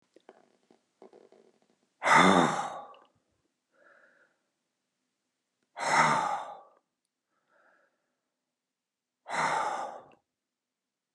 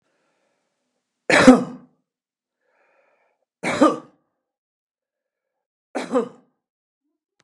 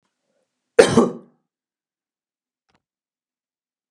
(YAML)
exhalation_length: 11.1 s
exhalation_amplitude: 14513
exhalation_signal_mean_std_ratio: 0.31
three_cough_length: 7.4 s
three_cough_amplitude: 32768
three_cough_signal_mean_std_ratio: 0.23
cough_length: 3.9 s
cough_amplitude: 32768
cough_signal_mean_std_ratio: 0.19
survey_phase: beta (2021-08-13 to 2022-03-07)
age: 65+
gender: Male
wearing_mask: 'No'
symptom_none: true
smoker_status: Never smoked
respiratory_condition_asthma: false
respiratory_condition_other: false
recruitment_source: REACT
submission_delay: 2 days
covid_test_result: Negative
covid_test_method: RT-qPCR
influenza_a_test_result: Negative
influenza_b_test_result: Negative